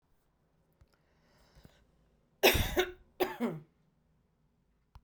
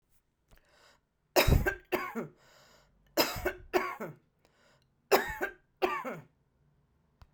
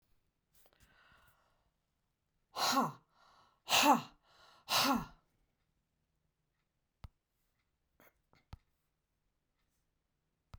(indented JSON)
{
  "cough_length": "5.0 s",
  "cough_amplitude": 11704,
  "cough_signal_mean_std_ratio": 0.28,
  "three_cough_length": "7.3 s",
  "three_cough_amplitude": 11834,
  "three_cough_signal_mean_std_ratio": 0.36,
  "exhalation_length": "10.6 s",
  "exhalation_amplitude": 5318,
  "exhalation_signal_mean_std_ratio": 0.25,
  "survey_phase": "beta (2021-08-13 to 2022-03-07)",
  "age": "65+",
  "gender": "Female",
  "wearing_mask": "No",
  "symptom_none": true,
  "smoker_status": "Ex-smoker",
  "respiratory_condition_asthma": false,
  "respiratory_condition_other": false,
  "recruitment_source": "REACT",
  "submission_delay": "1 day",
  "covid_test_result": "Negative",
  "covid_test_method": "RT-qPCR"
}